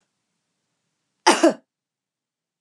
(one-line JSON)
{"cough_length": "2.6 s", "cough_amplitude": 31501, "cough_signal_mean_std_ratio": 0.22, "survey_phase": "beta (2021-08-13 to 2022-03-07)", "age": "45-64", "gender": "Female", "wearing_mask": "No", "symptom_none": true, "smoker_status": "Never smoked", "respiratory_condition_asthma": false, "respiratory_condition_other": false, "recruitment_source": "REACT", "submission_delay": "3 days", "covid_test_result": "Negative", "covid_test_method": "RT-qPCR"}